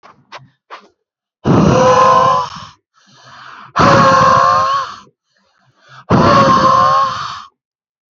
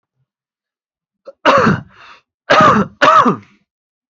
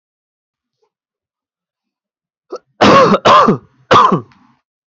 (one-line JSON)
{"exhalation_length": "8.1 s", "exhalation_amplitude": 29544, "exhalation_signal_mean_std_ratio": 0.61, "three_cough_length": "4.2 s", "three_cough_amplitude": 29782, "three_cough_signal_mean_std_ratio": 0.43, "cough_length": "4.9 s", "cough_amplitude": 29126, "cough_signal_mean_std_ratio": 0.39, "survey_phase": "beta (2021-08-13 to 2022-03-07)", "age": "18-44", "gender": "Male", "wearing_mask": "No", "symptom_runny_or_blocked_nose": true, "symptom_fatigue": true, "symptom_headache": true, "smoker_status": "Never smoked", "respiratory_condition_asthma": false, "respiratory_condition_other": false, "recruitment_source": "REACT", "submission_delay": "1 day", "covid_test_result": "Negative", "covid_test_method": "RT-qPCR", "influenza_a_test_result": "Unknown/Void", "influenza_b_test_result": "Unknown/Void"}